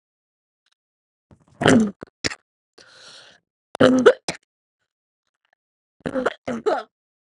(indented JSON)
{
  "three_cough_length": "7.3 s",
  "three_cough_amplitude": 32767,
  "three_cough_signal_mean_std_ratio": 0.28,
  "survey_phase": "beta (2021-08-13 to 2022-03-07)",
  "age": "18-44",
  "gender": "Female",
  "wearing_mask": "No",
  "symptom_cough_any": true,
  "symptom_new_continuous_cough": true,
  "symptom_runny_or_blocked_nose": true,
  "symptom_shortness_of_breath": true,
  "symptom_sore_throat": true,
  "symptom_abdominal_pain": true,
  "symptom_diarrhoea": true,
  "symptom_fatigue": true,
  "symptom_fever_high_temperature": true,
  "symptom_headache": true,
  "symptom_onset": "4 days",
  "smoker_status": "Ex-smoker",
  "respiratory_condition_asthma": false,
  "respiratory_condition_other": false,
  "recruitment_source": "Test and Trace",
  "submission_delay": "1 day",
  "covid_test_result": "Positive",
  "covid_test_method": "RT-qPCR",
  "covid_ct_value": 23.4,
  "covid_ct_gene": "N gene"
}